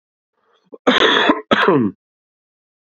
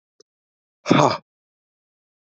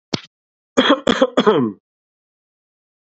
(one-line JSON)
{"cough_length": "2.8 s", "cough_amplitude": 31906, "cough_signal_mean_std_ratio": 0.47, "exhalation_length": "2.2 s", "exhalation_amplitude": 32768, "exhalation_signal_mean_std_ratio": 0.25, "three_cough_length": "3.1 s", "three_cough_amplitude": 28284, "three_cough_signal_mean_std_ratio": 0.38, "survey_phase": "beta (2021-08-13 to 2022-03-07)", "age": "18-44", "gender": "Male", "wearing_mask": "No", "symptom_runny_or_blocked_nose": true, "symptom_sore_throat": true, "smoker_status": "Ex-smoker", "respiratory_condition_asthma": false, "respiratory_condition_other": false, "recruitment_source": "Test and Trace", "submission_delay": "2 days", "covid_test_result": "Positive", "covid_test_method": "RT-qPCR", "covid_ct_value": 10.2, "covid_ct_gene": "ORF1ab gene"}